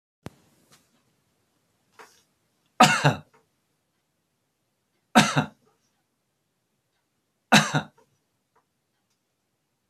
{"three_cough_length": "9.9 s", "three_cough_amplitude": 25364, "three_cough_signal_mean_std_ratio": 0.2, "survey_phase": "beta (2021-08-13 to 2022-03-07)", "age": "65+", "gender": "Male", "wearing_mask": "No", "symptom_none": true, "smoker_status": "Never smoked", "respiratory_condition_asthma": false, "respiratory_condition_other": false, "recruitment_source": "REACT", "submission_delay": "2 days", "covid_test_result": "Negative", "covid_test_method": "RT-qPCR", "influenza_a_test_result": "Unknown/Void", "influenza_b_test_result": "Unknown/Void"}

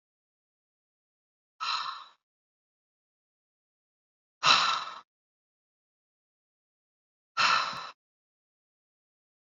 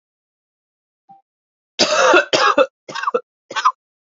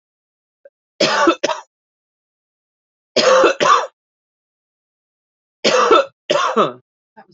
{"exhalation_length": "9.6 s", "exhalation_amplitude": 14999, "exhalation_signal_mean_std_ratio": 0.25, "cough_length": "4.2 s", "cough_amplitude": 32424, "cough_signal_mean_std_ratio": 0.4, "three_cough_length": "7.3 s", "three_cough_amplitude": 30161, "three_cough_signal_mean_std_ratio": 0.41, "survey_phase": "beta (2021-08-13 to 2022-03-07)", "age": "45-64", "gender": "Female", "wearing_mask": "No", "symptom_cough_any": true, "symptom_fatigue": true, "symptom_headache": true, "symptom_onset": "5 days", "smoker_status": "Never smoked", "respiratory_condition_asthma": true, "respiratory_condition_other": false, "recruitment_source": "Test and Trace", "submission_delay": "2 days", "covid_test_result": "Positive", "covid_test_method": "RT-qPCR", "covid_ct_value": 27.2, "covid_ct_gene": "ORF1ab gene"}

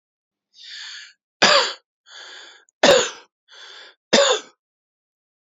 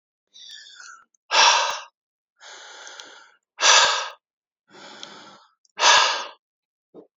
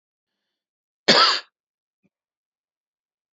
{"three_cough_length": "5.5 s", "three_cough_amplitude": 29103, "three_cough_signal_mean_std_ratio": 0.33, "exhalation_length": "7.2 s", "exhalation_amplitude": 27052, "exhalation_signal_mean_std_ratio": 0.36, "cough_length": "3.3 s", "cough_amplitude": 28810, "cough_signal_mean_std_ratio": 0.23, "survey_phase": "beta (2021-08-13 to 2022-03-07)", "age": "45-64", "gender": "Male", "wearing_mask": "No", "symptom_none": true, "smoker_status": "Never smoked", "respiratory_condition_asthma": false, "respiratory_condition_other": false, "recruitment_source": "REACT", "submission_delay": "1 day", "covid_test_result": "Negative", "covid_test_method": "RT-qPCR"}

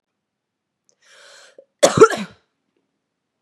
{"cough_length": "3.4 s", "cough_amplitude": 32768, "cough_signal_mean_std_ratio": 0.21, "survey_phase": "beta (2021-08-13 to 2022-03-07)", "age": "18-44", "gender": "Female", "wearing_mask": "No", "symptom_cough_any": true, "symptom_runny_or_blocked_nose": true, "symptom_fatigue": true, "symptom_onset": "2 days", "smoker_status": "Ex-smoker", "respiratory_condition_asthma": false, "respiratory_condition_other": false, "recruitment_source": "Test and Trace", "submission_delay": "1 day", "covid_test_result": "Positive", "covid_test_method": "ePCR"}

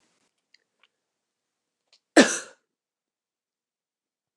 {"cough_length": "4.4 s", "cough_amplitude": 29202, "cough_signal_mean_std_ratio": 0.14, "survey_phase": "beta (2021-08-13 to 2022-03-07)", "age": "18-44", "gender": "Female", "wearing_mask": "No", "symptom_none": true, "smoker_status": "Never smoked", "respiratory_condition_asthma": false, "respiratory_condition_other": false, "recruitment_source": "REACT", "submission_delay": "1 day", "covid_test_result": "Negative", "covid_test_method": "RT-qPCR", "influenza_a_test_result": "Negative", "influenza_b_test_result": "Negative"}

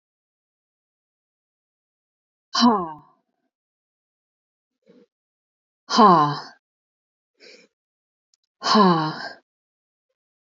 {"exhalation_length": "10.4 s", "exhalation_amplitude": 26869, "exhalation_signal_mean_std_ratio": 0.27, "survey_phase": "alpha (2021-03-01 to 2021-08-12)", "age": "18-44", "gender": "Female", "wearing_mask": "No", "symptom_none": true, "smoker_status": "Never smoked", "respiratory_condition_asthma": false, "respiratory_condition_other": false, "recruitment_source": "REACT", "submission_delay": "1 day", "covid_test_result": "Negative", "covid_test_method": "RT-qPCR"}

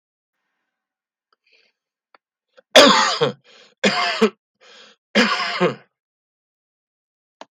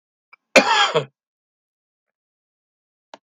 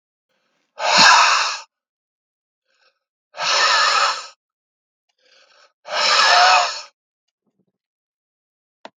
{"three_cough_length": "7.5 s", "three_cough_amplitude": 32768, "three_cough_signal_mean_std_ratio": 0.32, "cough_length": "3.2 s", "cough_amplitude": 32768, "cough_signal_mean_std_ratio": 0.27, "exhalation_length": "9.0 s", "exhalation_amplitude": 32768, "exhalation_signal_mean_std_ratio": 0.42, "survey_phase": "beta (2021-08-13 to 2022-03-07)", "age": "65+", "gender": "Male", "wearing_mask": "No", "symptom_none": true, "smoker_status": "Ex-smoker", "respiratory_condition_asthma": false, "respiratory_condition_other": true, "recruitment_source": "REACT", "submission_delay": "2 days", "covid_test_result": "Negative", "covid_test_method": "RT-qPCR", "influenza_a_test_result": "Negative", "influenza_b_test_result": "Negative"}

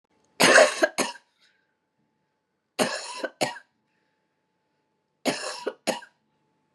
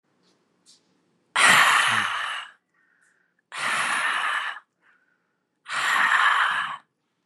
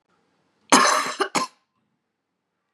{"three_cough_length": "6.7 s", "three_cough_amplitude": 25181, "three_cough_signal_mean_std_ratio": 0.3, "exhalation_length": "7.3 s", "exhalation_amplitude": 21445, "exhalation_signal_mean_std_ratio": 0.53, "cough_length": "2.7 s", "cough_amplitude": 30009, "cough_signal_mean_std_ratio": 0.34, "survey_phase": "beta (2021-08-13 to 2022-03-07)", "age": "65+", "gender": "Female", "wearing_mask": "Yes", "symptom_runny_or_blocked_nose": true, "symptom_fatigue": true, "symptom_headache": true, "smoker_status": "Never smoked", "respiratory_condition_asthma": false, "respiratory_condition_other": false, "recruitment_source": "Test and Trace", "submission_delay": "1 day", "covid_test_result": "Negative", "covid_test_method": "RT-qPCR"}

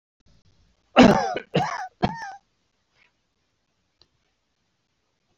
{"three_cough_length": "5.4 s", "three_cough_amplitude": 28941, "three_cough_signal_mean_std_ratio": 0.25, "survey_phase": "beta (2021-08-13 to 2022-03-07)", "age": "65+", "gender": "Male", "wearing_mask": "No", "symptom_runny_or_blocked_nose": true, "symptom_shortness_of_breath": true, "symptom_diarrhoea": true, "smoker_status": "Ex-smoker", "respiratory_condition_asthma": false, "respiratory_condition_other": false, "recruitment_source": "REACT", "submission_delay": "1 day", "covid_test_result": "Negative", "covid_test_method": "RT-qPCR", "influenza_a_test_result": "Negative", "influenza_b_test_result": "Negative"}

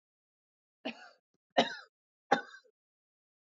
{"three_cough_length": "3.6 s", "three_cough_amplitude": 8429, "three_cough_signal_mean_std_ratio": 0.2, "survey_phase": "beta (2021-08-13 to 2022-03-07)", "age": "45-64", "gender": "Female", "wearing_mask": "No", "symptom_none": true, "smoker_status": "Never smoked", "respiratory_condition_asthma": true, "respiratory_condition_other": false, "recruitment_source": "REACT", "submission_delay": "1 day", "covid_test_result": "Negative", "covid_test_method": "RT-qPCR", "influenza_a_test_result": "Negative", "influenza_b_test_result": "Negative"}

